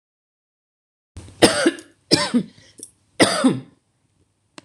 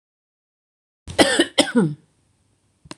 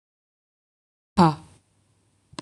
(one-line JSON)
{"three_cough_length": "4.6 s", "three_cough_amplitude": 26028, "three_cough_signal_mean_std_ratio": 0.34, "cough_length": "3.0 s", "cough_amplitude": 26027, "cough_signal_mean_std_ratio": 0.33, "exhalation_length": "2.4 s", "exhalation_amplitude": 21409, "exhalation_signal_mean_std_ratio": 0.21, "survey_phase": "alpha (2021-03-01 to 2021-08-12)", "age": "45-64", "gender": "Female", "wearing_mask": "No", "symptom_none": true, "smoker_status": "Ex-smoker", "respiratory_condition_asthma": false, "respiratory_condition_other": false, "recruitment_source": "REACT", "submission_delay": "-1 day", "covid_test_result": "Negative", "covid_test_method": "RT-qPCR"}